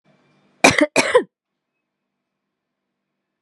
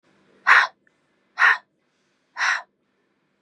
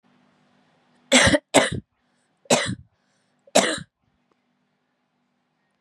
{
  "cough_length": "3.4 s",
  "cough_amplitude": 32768,
  "cough_signal_mean_std_ratio": 0.25,
  "exhalation_length": "3.4 s",
  "exhalation_amplitude": 30153,
  "exhalation_signal_mean_std_ratio": 0.31,
  "three_cough_length": "5.8 s",
  "three_cough_amplitude": 32767,
  "three_cough_signal_mean_std_ratio": 0.29,
  "survey_phase": "beta (2021-08-13 to 2022-03-07)",
  "age": "18-44",
  "gender": "Female",
  "wearing_mask": "No",
  "symptom_cough_any": true,
  "symptom_runny_or_blocked_nose": true,
  "smoker_status": "Never smoked",
  "respiratory_condition_asthma": true,
  "respiratory_condition_other": false,
  "recruitment_source": "REACT",
  "submission_delay": "2 days",
  "covid_test_result": "Negative",
  "covid_test_method": "RT-qPCR",
  "influenza_a_test_result": "Negative",
  "influenza_b_test_result": "Negative"
}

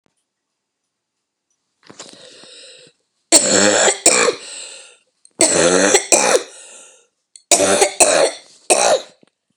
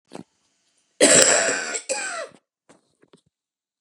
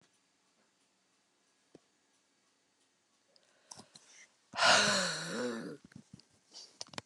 {
  "three_cough_length": "9.6 s",
  "three_cough_amplitude": 32768,
  "three_cough_signal_mean_std_ratio": 0.46,
  "cough_length": "3.8 s",
  "cough_amplitude": 32768,
  "cough_signal_mean_std_ratio": 0.38,
  "exhalation_length": "7.1 s",
  "exhalation_amplitude": 7826,
  "exhalation_signal_mean_std_ratio": 0.3,
  "survey_phase": "beta (2021-08-13 to 2022-03-07)",
  "age": "45-64",
  "gender": "Female",
  "wearing_mask": "No",
  "symptom_new_continuous_cough": true,
  "symptom_runny_or_blocked_nose": true,
  "symptom_shortness_of_breath": true,
  "symptom_fatigue": true,
  "symptom_headache": true,
  "symptom_change_to_sense_of_smell_or_taste": true,
  "symptom_onset": "3 days",
  "smoker_status": "Never smoked",
  "respiratory_condition_asthma": false,
  "respiratory_condition_other": false,
  "recruitment_source": "Test and Trace",
  "submission_delay": "2 days",
  "covid_test_result": "Positive",
  "covid_test_method": "ePCR"
}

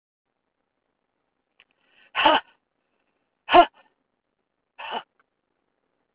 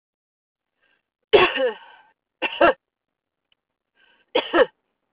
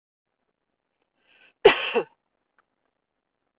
{
  "exhalation_length": "6.1 s",
  "exhalation_amplitude": 22246,
  "exhalation_signal_mean_std_ratio": 0.2,
  "three_cough_length": "5.1 s",
  "three_cough_amplitude": 26830,
  "three_cough_signal_mean_std_ratio": 0.3,
  "cough_length": "3.6 s",
  "cough_amplitude": 26897,
  "cough_signal_mean_std_ratio": 0.18,
  "survey_phase": "beta (2021-08-13 to 2022-03-07)",
  "age": "45-64",
  "gender": "Female",
  "wearing_mask": "No",
  "symptom_none": true,
  "smoker_status": "Never smoked",
  "respiratory_condition_asthma": false,
  "respiratory_condition_other": false,
  "recruitment_source": "REACT",
  "submission_delay": "3 days",
  "covid_test_result": "Negative",
  "covid_test_method": "RT-qPCR"
}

